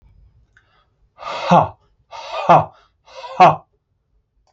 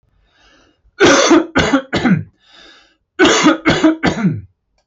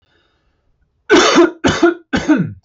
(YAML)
exhalation_length: 4.5 s
exhalation_amplitude: 27899
exhalation_signal_mean_std_ratio: 0.32
cough_length: 4.9 s
cough_amplitude: 32768
cough_signal_mean_std_ratio: 0.56
three_cough_length: 2.6 s
three_cough_amplitude: 30547
three_cough_signal_mean_std_ratio: 0.53
survey_phase: alpha (2021-03-01 to 2021-08-12)
age: 18-44
gender: Male
wearing_mask: 'No'
symptom_none: true
smoker_status: Ex-smoker
respiratory_condition_asthma: false
respiratory_condition_other: false
recruitment_source: REACT
submission_delay: 1 day
covid_test_result: Negative
covid_test_method: RT-qPCR